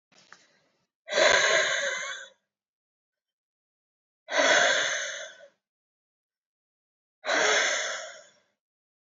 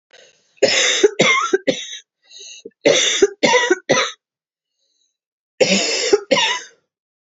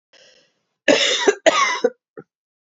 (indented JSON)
{
  "exhalation_length": "9.1 s",
  "exhalation_amplitude": 12316,
  "exhalation_signal_mean_std_ratio": 0.43,
  "three_cough_length": "7.3 s",
  "three_cough_amplitude": 30168,
  "three_cough_signal_mean_std_ratio": 0.51,
  "cough_length": "2.7 s",
  "cough_amplitude": 28683,
  "cough_signal_mean_std_ratio": 0.43,
  "survey_phase": "beta (2021-08-13 to 2022-03-07)",
  "age": "45-64",
  "gender": "Female",
  "wearing_mask": "No",
  "symptom_runny_or_blocked_nose": true,
  "symptom_sore_throat": true,
  "symptom_fatigue": true,
  "symptom_headache": true,
  "smoker_status": "Current smoker (1 to 10 cigarettes per day)",
  "respiratory_condition_asthma": false,
  "respiratory_condition_other": false,
  "recruitment_source": "Test and Trace",
  "submission_delay": "2 days",
  "covid_test_result": "Positive",
  "covid_test_method": "RT-qPCR",
  "covid_ct_value": 14.7,
  "covid_ct_gene": "ORF1ab gene",
  "covid_ct_mean": 14.9,
  "covid_viral_load": "13000000 copies/ml",
  "covid_viral_load_category": "High viral load (>1M copies/ml)"
}